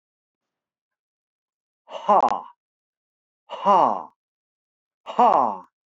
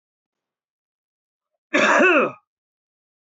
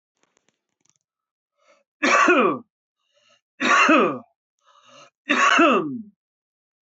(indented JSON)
{
  "exhalation_length": "5.9 s",
  "exhalation_amplitude": 20298,
  "exhalation_signal_mean_std_ratio": 0.32,
  "cough_length": "3.3 s",
  "cough_amplitude": 19204,
  "cough_signal_mean_std_ratio": 0.34,
  "three_cough_length": "6.8 s",
  "three_cough_amplitude": 19460,
  "three_cough_signal_mean_std_ratio": 0.42,
  "survey_phase": "beta (2021-08-13 to 2022-03-07)",
  "age": "45-64",
  "gender": "Male",
  "wearing_mask": "No",
  "symptom_fatigue": true,
  "smoker_status": "Ex-smoker",
  "respiratory_condition_asthma": false,
  "respiratory_condition_other": false,
  "recruitment_source": "REACT",
  "submission_delay": "0 days",
  "covid_test_result": "Negative",
  "covid_test_method": "RT-qPCR"
}